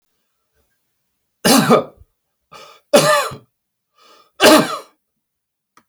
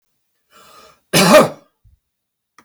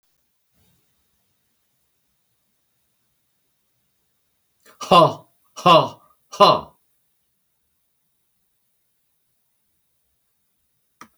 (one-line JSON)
{"three_cough_length": "5.9 s", "three_cough_amplitude": 32768, "three_cough_signal_mean_std_ratio": 0.34, "cough_length": "2.6 s", "cough_amplitude": 32768, "cough_signal_mean_std_ratio": 0.31, "exhalation_length": "11.2 s", "exhalation_amplitude": 31454, "exhalation_signal_mean_std_ratio": 0.19, "survey_phase": "alpha (2021-03-01 to 2021-08-12)", "age": "65+", "gender": "Male", "wearing_mask": "No", "symptom_none": true, "smoker_status": "Never smoked", "respiratory_condition_asthma": false, "respiratory_condition_other": false, "recruitment_source": "REACT", "submission_delay": "3 days", "covid_test_result": "Negative", "covid_test_method": "RT-qPCR"}